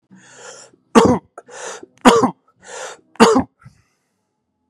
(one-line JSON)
{"three_cough_length": "4.7 s", "three_cough_amplitude": 32768, "three_cough_signal_mean_std_ratio": 0.33, "survey_phase": "beta (2021-08-13 to 2022-03-07)", "age": "18-44", "gender": "Male", "wearing_mask": "No", "symptom_cough_any": true, "symptom_fever_high_temperature": true, "symptom_headache": true, "symptom_onset": "2 days", "smoker_status": "Never smoked", "respiratory_condition_asthma": false, "respiratory_condition_other": false, "recruitment_source": "REACT", "submission_delay": "2 days", "covid_test_result": "Negative", "covid_test_method": "RT-qPCR", "influenza_a_test_result": "Negative", "influenza_b_test_result": "Negative"}